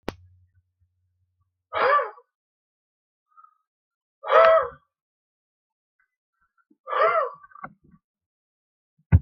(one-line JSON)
{"exhalation_length": "9.2 s", "exhalation_amplitude": 27111, "exhalation_signal_mean_std_ratio": 0.28, "survey_phase": "beta (2021-08-13 to 2022-03-07)", "age": "65+", "gender": "Male", "wearing_mask": "No", "symptom_none": true, "smoker_status": "Never smoked", "respiratory_condition_asthma": false, "respiratory_condition_other": false, "recruitment_source": "REACT", "submission_delay": "2 days", "covid_test_result": "Negative", "covid_test_method": "RT-qPCR", "influenza_a_test_result": "Negative", "influenza_b_test_result": "Negative"}